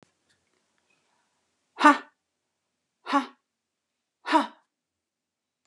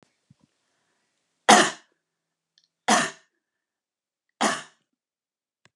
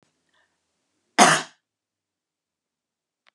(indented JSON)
{
  "exhalation_length": "5.7 s",
  "exhalation_amplitude": 22869,
  "exhalation_signal_mean_std_ratio": 0.2,
  "three_cough_length": "5.8 s",
  "three_cough_amplitude": 32745,
  "three_cough_signal_mean_std_ratio": 0.22,
  "cough_length": "3.3 s",
  "cough_amplitude": 32445,
  "cough_signal_mean_std_ratio": 0.19,
  "survey_phase": "beta (2021-08-13 to 2022-03-07)",
  "age": "45-64",
  "gender": "Female",
  "wearing_mask": "No",
  "symptom_none": true,
  "smoker_status": "Never smoked",
  "respiratory_condition_asthma": false,
  "respiratory_condition_other": false,
  "recruitment_source": "REACT",
  "submission_delay": "1 day",
  "covid_test_result": "Negative",
  "covid_test_method": "RT-qPCR"
}